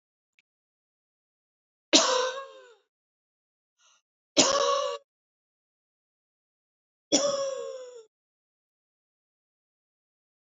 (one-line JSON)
{"three_cough_length": "10.4 s", "three_cough_amplitude": 24530, "three_cough_signal_mean_std_ratio": 0.29, "survey_phase": "beta (2021-08-13 to 2022-03-07)", "age": "45-64", "gender": "Female", "wearing_mask": "No", "symptom_runny_or_blocked_nose": true, "smoker_status": "Never smoked", "respiratory_condition_asthma": false, "respiratory_condition_other": false, "recruitment_source": "Test and Trace", "submission_delay": "-1 day", "covid_test_result": "Negative", "covid_test_method": "LFT"}